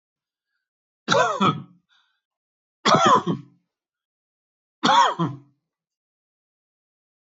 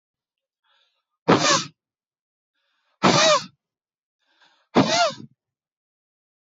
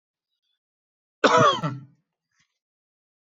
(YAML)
three_cough_length: 7.3 s
three_cough_amplitude: 19533
three_cough_signal_mean_std_ratio: 0.34
exhalation_length: 6.5 s
exhalation_amplitude: 23960
exhalation_signal_mean_std_ratio: 0.33
cough_length: 3.3 s
cough_amplitude: 19567
cough_signal_mean_std_ratio: 0.28
survey_phase: beta (2021-08-13 to 2022-03-07)
age: 45-64
gender: Male
wearing_mask: 'No'
symptom_none: true
smoker_status: Ex-smoker
respiratory_condition_asthma: false
respiratory_condition_other: false
recruitment_source: REACT
submission_delay: 1 day
covid_test_result: Negative
covid_test_method: RT-qPCR